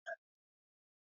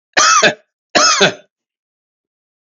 cough_length: 1.1 s
cough_amplitude: 653
cough_signal_mean_std_ratio: 0.22
three_cough_length: 2.6 s
three_cough_amplitude: 32150
three_cough_signal_mean_std_ratio: 0.45
survey_phase: alpha (2021-03-01 to 2021-08-12)
age: 65+
gender: Male
wearing_mask: 'No'
symptom_cough_any: true
symptom_fatigue: true
symptom_onset: 4 days
smoker_status: Ex-smoker
respiratory_condition_asthma: false
respiratory_condition_other: false
recruitment_source: Test and Trace
submission_delay: 2 days
covid_test_result: Positive
covid_test_method: RT-qPCR
covid_ct_value: 17.3
covid_ct_gene: ORF1ab gene
covid_ct_mean: 18.1
covid_viral_load: 1200000 copies/ml
covid_viral_load_category: High viral load (>1M copies/ml)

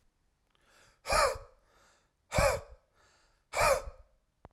exhalation_length: 4.5 s
exhalation_amplitude: 7000
exhalation_signal_mean_std_ratio: 0.36
survey_phase: alpha (2021-03-01 to 2021-08-12)
age: 18-44
gender: Male
wearing_mask: 'No'
symptom_none: true
smoker_status: Ex-smoker
respiratory_condition_asthma: false
respiratory_condition_other: false
recruitment_source: REACT
submission_delay: 1 day
covid_test_result: Negative
covid_test_method: RT-qPCR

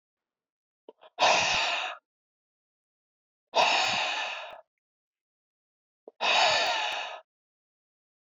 exhalation_length: 8.4 s
exhalation_amplitude: 10850
exhalation_signal_mean_std_ratio: 0.44
survey_phase: beta (2021-08-13 to 2022-03-07)
age: 65+
gender: Male
wearing_mask: 'No'
symptom_none: true
smoker_status: Never smoked
respiratory_condition_asthma: false
respiratory_condition_other: false
recruitment_source: REACT
submission_delay: 3 days
covid_test_result: Negative
covid_test_method: RT-qPCR
influenza_a_test_result: Negative
influenza_b_test_result: Negative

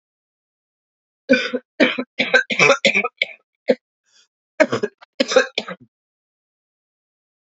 cough_length: 7.4 s
cough_amplitude: 32233
cough_signal_mean_std_ratio: 0.34
survey_phase: beta (2021-08-13 to 2022-03-07)
age: 45-64
gender: Female
wearing_mask: 'No'
symptom_cough_any: true
symptom_runny_or_blocked_nose: true
symptom_sore_throat: true
symptom_fatigue: true
symptom_onset: 2 days
smoker_status: Ex-smoker
respiratory_condition_asthma: false
respiratory_condition_other: false
recruitment_source: Test and Trace
submission_delay: 1 day
covid_test_result: Negative
covid_test_method: RT-qPCR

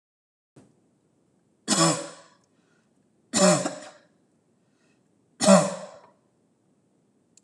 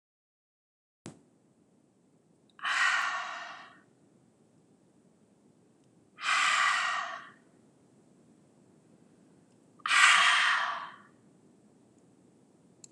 three_cough_length: 7.4 s
three_cough_amplitude: 19804
three_cough_signal_mean_std_ratio: 0.29
exhalation_length: 12.9 s
exhalation_amplitude: 14189
exhalation_signal_mean_std_ratio: 0.37
survey_phase: alpha (2021-03-01 to 2021-08-12)
age: 45-64
gender: Female
wearing_mask: 'No'
symptom_none: true
smoker_status: Ex-smoker
respiratory_condition_asthma: false
respiratory_condition_other: false
recruitment_source: REACT
submission_delay: 1 day
covid_test_result: Negative
covid_test_method: RT-qPCR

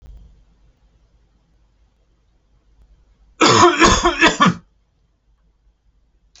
three_cough_length: 6.4 s
three_cough_amplitude: 32767
three_cough_signal_mean_std_ratio: 0.32
survey_phase: alpha (2021-03-01 to 2021-08-12)
age: 45-64
gender: Male
wearing_mask: 'No'
symptom_none: true
smoker_status: Never smoked
respiratory_condition_asthma: false
respiratory_condition_other: false
recruitment_source: REACT
submission_delay: 2 days
covid_test_result: Negative
covid_test_method: RT-qPCR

